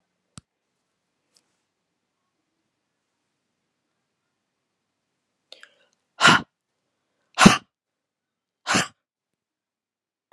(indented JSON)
{
  "exhalation_length": "10.3 s",
  "exhalation_amplitude": 32768,
  "exhalation_signal_mean_std_ratio": 0.16,
  "survey_phase": "beta (2021-08-13 to 2022-03-07)",
  "age": "65+",
  "gender": "Female",
  "wearing_mask": "No",
  "symptom_shortness_of_breath": true,
  "smoker_status": "Never smoked",
  "respiratory_condition_asthma": false,
  "respiratory_condition_other": true,
  "recruitment_source": "REACT",
  "submission_delay": "1 day",
  "covid_test_result": "Negative",
  "covid_test_method": "RT-qPCR",
  "influenza_a_test_result": "Negative",
  "influenza_b_test_result": "Negative"
}